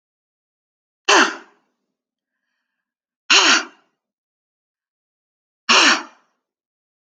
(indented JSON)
{
  "exhalation_length": "7.2 s",
  "exhalation_amplitude": 32768,
  "exhalation_signal_mean_std_ratio": 0.28,
  "survey_phase": "alpha (2021-03-01 to 2021-08-12)",
  "age": "18-44",
  "gender": "Female",
  "wearing_mask": "No",
  "symptom_none": true,
  "smoker_status": "Never smoked",
  "respiratory_condition_asthma": false,
  "respiratory_condition_other": false,
  "recruitment_source": "REACT",
  "submission_delay": "2 days",
  "covid_test_result": "Negative",
  "covid_test_method": "RT-qPCR"
}